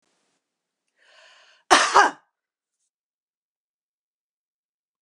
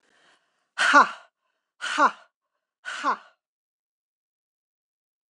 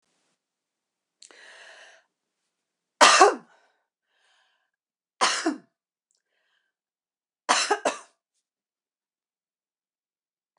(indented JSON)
{
  "cough_length": "5.0 s",
  "cough_amplitude": 26178,
  "cough_signal_mean_std_ratio": 0.2,
  "exhalation_length": "5.3 s",
  "exhalation_amplitude": 23862,
  "exhalation_signal_mean_std_ratio": 0.27,
  "three_cough_length": "10.6 s",
  "three_cough_amplitude": 26461,
  "three_cough_signal_mean_std_ratio": 0.21,
  "survey_phase": "beta (2021-08-13 to 2022-03-07)",
  "age": "45-64",
  "gender": "Female",
  "wearing_mask": "No",
  "symptom_none": true,
  "smoker_status": "Never smoked",
  "respiratory_condition_asthma": false,
  "respiratory_condition_other": false,
  "recruitment_source": "REACT",
  "submission_delay": "2 days",
  "covid_test_result": "Negative",
  "covid_test_method": "RT-qPCR",
  "influenza_a_test_result": "Negative",
  "influenza_b_test_result": "Negative"
}